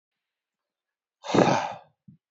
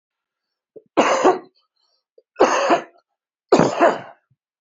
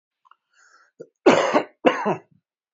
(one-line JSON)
{"exhalation_length": "2.3 s", "exhalation_amplitude": 20114, "exhalation_signal_mean_std_ratio": 0.32, "three_cough_length": "4.6 s", "three_cough_amplitude": 31343, "three_cough_signal_mean_std_ratio": 0.4, "cough_length": "2.7 s", "cough_amplitude": 26251, "cough_signal_mean_std_ratio": 0.35, "survey_phase": "beta (2021-08-13 to 2022-03-07)", "age": "45-64", "gender": "Male", "wearing_mask": "No", "symptom_runny_or_blocked_nose": true, "symptom_shortness_of_breath": true, "symptom_fatigue": true, "symptom_onset": "12 days", "smoker_status": "Current smoker (11 or more cigarettes per day)", "respiratory_condition_asthma": false, "respiratory_condition_other": false, "recruitment_source": "REACT", "submission_delay": "1 day", "covid_test_result": "Negative", "covid_test_method": "RT-qPCR", "influenza_a_test_result": "Negative", "influenza_b_test_result": "Negative"}